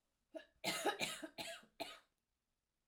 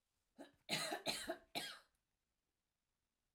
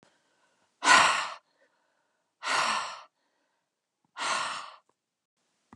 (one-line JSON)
{"cough_length": "2.9 s", "cough_amplitude": 2101, "cough_signal_mean_std_ratio": 0.43, "three_cough_length": "3.3 s", "three_cough_amplitude": 1639, "three_cough_signal_mean_std_ratio": 0.4, "exhalation_length": "5.8 s", "exhalation_amplitude": 16256, "exhalation_signal_mean_std_ratio": 0.34, "survey_phase": "alpha (2021-03-01 to 2021-08-12)", "age": "45-64", "gender": "Female", "wearing_mask": "No", "symptom_none": true, "smoker_status": "Never smoked", "respiratory_condition_asthma": true, "respiratory_condition_other": false, "recruitment_source": "REACT", "submission_delay": "1 day", "covid_test_result": "Negative", "covid_test_method": "RT-qPCR"}